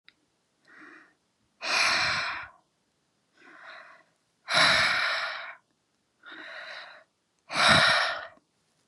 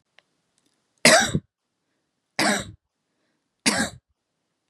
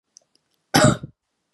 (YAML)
exhalation_length: 8.9 s
exhalation_amplitude: 17492
exhalation_signal_mean_std_ratio: 0.43
three_cough_length: 4.7 s
three_cough_amplitude: 30528
three_cough_signal_mean_std_ratio: 0.29
cough_length: 1.5 s
cough_amplitude: 28722
cough_signal_mean_std_ratio: 0.3
survey_phase: beta (2021-08-13 to 2022-03-07)
age: 18-44
gender: Female
wearing_mask: 'No'
symptom_none: true
smoker_status: Never smoked
respiratory_condition_asthma: false
respiratory_condition_other: false
recruitment_source: REACT
submission_delay: 8 days
covid_test_result: Negative
covid_test_method: RT-qPCR
influenza_a_test_result: Negative
influenza_b_test_result: Negative